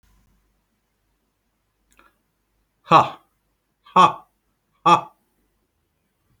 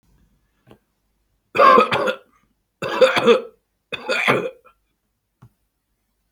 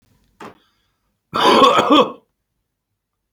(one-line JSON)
{"exhalation_length": "6.4 s", "exhalation_amplitude": 29321, "exhalation_signal_mean_std_ratio": 0.21, "three_cough_length": "6.3 s", "three_cough_amplitude": 27718, "three_cough_signal_mean_std_ratio": 0.36, "cough_length": "3.3 s", "cough_amplitude": 32768, "cough_signal_mean_std_ratio": 0.38, "survey_phase": "alpha (2021-03-01 to 2021-08-12)", "age": "45-64", "gender": "Male", "wearing_mask": "No", "symptom_none": true, "smoker_status": "Never smoked", "respiratory_condition_asthma": false, "respiratory_condition_other": false, "recruitment_source": "REACT", "submission_delay": "7 days", "covid_test_method": "RT-qPCR"}